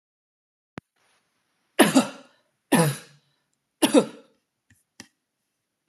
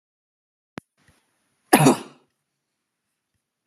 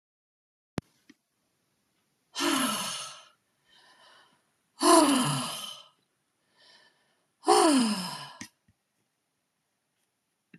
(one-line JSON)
{"three_cough_length": "5.9 s", "three_cough_amplitude": 30722, "three_cough_signal_mean_std_ratio": 0.26, "cough_length": "3.7 s", "cough_amplitude": 32767, "cough_signal_mean_std_ratio": 0.2, "exhalation_length": "10.6 s", "exhalation_amplitude": 17339, "exhalation_signal_mean_std_ratio": 0.34, "survey_phase": "beta (2021-08-13 to 2022-03-07)", "age": "45-64", "gender": "Female", "wearing_mask": "No", "symptom_none": true, "smoker_status": "Never smoked", "respiratory_condition_asthma": false, "respiratory_condition_other": false, "recruitment_source": "Test and Trace", "submission_delay": "2 days", "covid_test_result": "Positive", "covid_test_method": "RT-qPCR", "covid_ct_value": 37.4, "covid_ct_gene": "ORF1ab gene"}